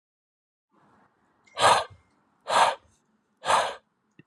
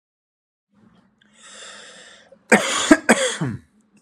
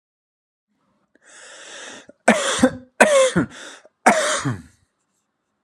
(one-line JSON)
{"exhalation_length": "4.3 s", "exhalation_amplitude": 15561, "exhalation_signal_mean_std_ratio": 0.33, "cough_length": "4.0 s", "cough_amplitude": 32767, "cough_signal_mean_std_ratio": 0.32, "three_cough_length": "5.6 s", "three_cough_amplitude": 32767, "three_cough_signal_mean_std_ratio": 0.38, "survey_phase": "beta (2021-08-13 to 2022-03-07)", "age": "45-64", "gender": "Male", "wearing_mask": "No", "symptom_cough_any": true, "symptom_runny_or_blocked_nose": true, "symptom_onset": "8 days", "smoker_status": "Ex-smoker", "respiratory_condition_asthma": false, "respiratory_condition_other": true, "recruitment_source": "REACT", "submission_delay": "0 days", "covid_test_result": "Negative", "covid_test_method": "RT-qPCR"}